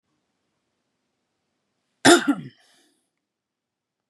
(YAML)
cough_length: 4.1 s
cough_amplitude: 28607
cough_signal_mean_std_ratio: 0.19
survey_phase: beta (2021-08-13 to 2022-03-07)
age: 45-64
gender: Male
wearing_mask: 'No'
symptom_none: true
smoker_status: Never smoked
respiratory_condition_asthma: true
respiratory_condition_other: false
recruitment_source: REACT
submission_delay: 1 day
covid_test_result: Negative
covid_test_method: RT-qPCR